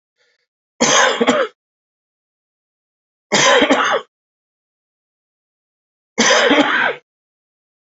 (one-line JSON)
{"three_cough_length": "7.9 s", "three_cough_amplitude": 31440, "three_cough_signal_mean_std_ratio": 0.42, "survey_phase": "alpha (2021-03-01 to 2021-08-12)", "age": "45-64", "gender": "Male", "wearing_mask": "No", "symptom_cough_any": true, "symptom_fever_high_temperature": true, "symptom_headache": true, "symptom_onset": "3 days", "smoker_status": "Ex-smoker", "respiratory_condition_asthma": true, "respiratory_condition_other": false, "recruitment_source": "Test and Trace", "submission_delay": "2 days", "covid_test_result": "Positive", "covid_test_method": "RT-qPCR", "covid_ct_value": 20.0, "covid_ct_gene": "ORF1ab gene"}